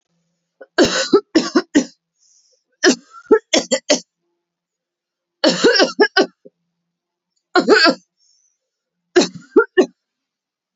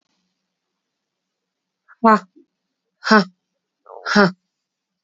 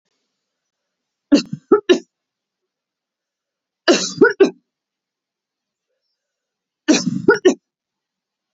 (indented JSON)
{
  "cough_length": "10.8 s",
  "cough_amplitude": 32768,
  "cough_signal_mean_std_ratio": 0.37,
  "exhalation_length": "5.0 s",
  "exhalation_amplitude": 28021,
  "exhalation_signal_mean_std_ratio": 0.26,
  "three_cough_length": "8.5 s",
  "three_cough_amplitude": 32767,
  "three_cough_signal_mean_std_ratio": 0.27,
  "survey_phase": "beta (2021-08-13 to 2022-03-07)",
  "age": "18-44",
  "gender": "Female",
  "wearing_mask": "No",
  "symptom_cough_any": true,
  "symptom_runny_or_blocked_nose": true,
  "symptom_shortness_of_breath": true,
  "symptom_sore_throat": true,
  "symptom_fatigue": true,
  "symptom_change_to_sense_of_smell_or_taste": true,
  "symptom_onset": "3 days",
  "smoker_status": "Never smoked",
  "respiratory_condition_asthma": false,
  "respiratory_condition_other": false,
  "recruitment_source": "Test and Trace",
  "submission_delay": "2 days",
  "covid_test_result": "Positive",
  "covid_test_method": "RT-qPCR",
  "covid_ct_value": 32.2,
  "covid_ct_gene": "ORF1ab gene",
  "covid_ct_mean": 32.7,
  "covid_viral_load": "19 copies/ml",
  "covid_viral_load_category": "Minimal viral load (< 10K copies/ml)"
}